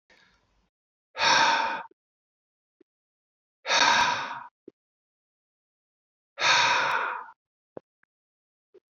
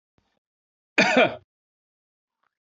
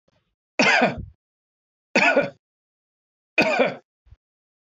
{"exhalation_length": "9.0 s", "exhalation_amplitude": 13791, "exhalation_signal_mean_std_ratio": 0.39, "cough_length": "2.7 s", "cough_amplitude": 20459, "cough_signal_mean_std_ratio": 0.27, "three_cough_length": "4.6 s", "three_cough_amplitude": 17761, "three_cough_signal_mean_std_ratio": 0.38, "survey_phase": "beta (2021-08-13 to 2022-03-07)", "age": "45-64", "gender": "Male", "wearing_mask": "No", "symptom_none": true, "smoker_status": "Never smoked", "respiratory_condition_asthma": false, "respiratory_condition_other": false, "recruitment_source": "Test and Trace", "submission_delay": "0 days", "covid_test_result": "Negative", "covid_test_method": "LFT"}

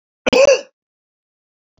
{"cough_length": "1.8 s", "cough_amplitude": 28791, "cough_signal_mean_std_ratio": 0.33, "survey_phase": "alpha (2021-03-01 to 2021-08-12)", "age": "65+", "gender": "Male", "wearing_mask": "No", "symptom_cough_any": true, "smoker_status": "Ex-smoker", "respiratory_condition_asthma": false, "respiratory_condition_other": false, "recruitment_source": "REACT", "submission_delay": "1 day", "covid_test_result": "Negative", "covid_test_method": "RT-qPCR"}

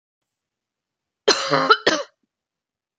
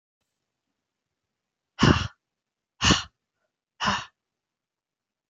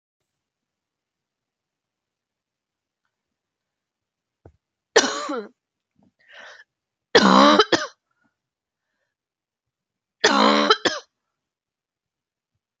{"cough_length": "3.0 s", "cough_amplitude": 30498, "cough_signal_mean_std_ratio": 0.32, "exhalation_length": "5.3 s", "exhalation_amplitude": 18451, "exhalation_signal_mean_std_ratio": 0.25, "three_cough_length": "12.8 s", "three_cough_amplitude": 29462, "three_cough_signal_mean_std_ratio": 0.25, "survey_phase": "beta (2021-08-13 to 2022-03-07)", "age": "18-44", "gender": "Female", "wearing_mask": "No", "symptom_cough_any": true, "symptom_runny_or_blocked_nose": true, "symptom_fatigue": true, "symptom_onset": "6 days", "smoker_status": "Never smoked", "respiratory_condition_asthma": false, "respiratory_condition_other": false, "recruitment_source": "Test and Trace", "submission_delay": "3 days", "covid_test_result": "Positive", "covid_test_method": "RT-qPCR", "covid_ct_value": 18.3, "covid_ct_gene": "ORF1ab gene", "covid_ct_mean": 18.6, "covid_viral_load": "820000 copies/ml", "covid_viral_load_category": "Low viral load (10K-1M copies/ml)"}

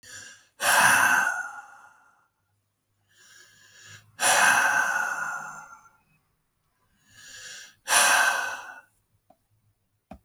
{"exhalation_length": "10.2 s", "exhalation_amplitude": 16636, "exhalation_signal_mean_std_ratio": 0.44, "survey_phase": "alpha (2021-03-01 to 2021-08-12)", "age": "65+", "gender": "Male", "wearing_mask": "No", "symptom_none": true, "smoker_status": "Never smoked", "respiratory_condition_asthma": false, "respiratory_condition_other": false, "recruitment_source": "REACT", "submission_delay": "3 days", "covid_test_result": "Negative", "covid_test_method": "RT-qPCR"}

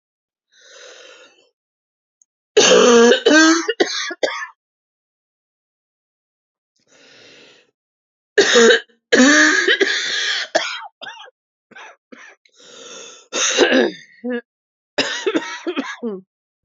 {"three_cough_length": "16.6 s", "three_cough_amplitude": 32767, "three_cough_signal_mean_std_ratio": 0.42, "survey_phase": "beta (2021-08-13 to 2022-03-07)", "age": "18-44", "gender": "Female", "wearing_mask": "No", "symptom_cough_any": true, "symptom_new_continuous_cough": true, "symptom_runny_or_blocked_nose": true, "symptom_shortness_of_breath": true, "symptom_sore_throat": true, "symptom_fatigue": true, "symptom_headache": true, "symptom_onset": "7 days", "smoker_status": "Never smoked", "respiratory_condition_asthma": true, "respiratory_condition_other": false, "recruitment_source": "Test and Trace", "submission_delay": "1 day", "covid_test_result": "Positive", "covid_test_method": "ePCR"}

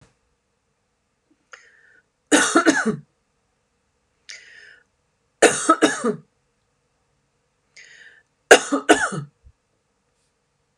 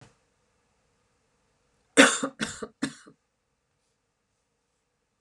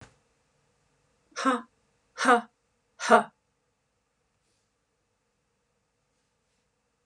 {"three_cough_length": "10.8 s", "three_cough_amplitude": 32768, "three_cough_signal_mean_std_ratio": 0.27, "cough_length": "5.2 s", "cough_amplitude": 32323, "cough_signal_mean_std_ratio": 0.19, "exhalation_length": "7.1 s", "exhalation_amplitude": 17278, "exhalation_signal_mean_std_ratio": 0.21, "survey_phase": "beta (2021-08-13 to 2022-03-07)", "age": "45-64", "gender": "Female", "wearing_mask": "No", "symptom_none": true, "smoker_status": "Never smoked", "respiratory_condition_asthma": false, "respiratory_condition_other": false, "recruitment_source": "REACT", "submission_delay": "1 day", "covid_test_result": "Negative", "covid_test_method": "RT-qPCR"}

